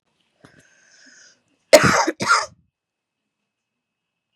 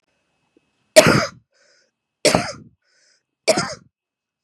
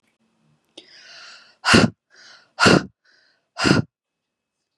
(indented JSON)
{
  "cough_length": "4.4 s",
  "cough_amplitude": 32768,
  "cough_signal_mean_std_ratio": 0.26,
  "three_cough_length": "4.4 s",
  "three_cough_amplitude": 32768,
  "three_cough_signal_mean_std_ratio": 0.28,
  "exhalation_length": "4.8 s",
  "exhalation_amplitude": 32767,
  "exhalation_signal_mean_std_ratio": 0.3,
  "survey_phase": "beta (2021-08-13 to 2022-03-07)",
  "age": "18-44",
  "gender": "Female",
  "wearing_mask": "No",
  "symptom_cough_any": true,
  "symptom_runny_or_blocked_nose": true,
  "symptom_sore_throat": true,
  "symptom_fatigue": true,
  "symptom_headache": true,
  "smoker_status": "Current smoker (1 to 10 cigarettes per day)",
  "respiratory_condition_asthma": false,
  "respiratory_condition_other": false,
  "recruitment_source": "Test and Trace",
  "submission_delay": "2 days",
  "covid_test_result": "Positive",
  "covid_test_method": "LFT"
}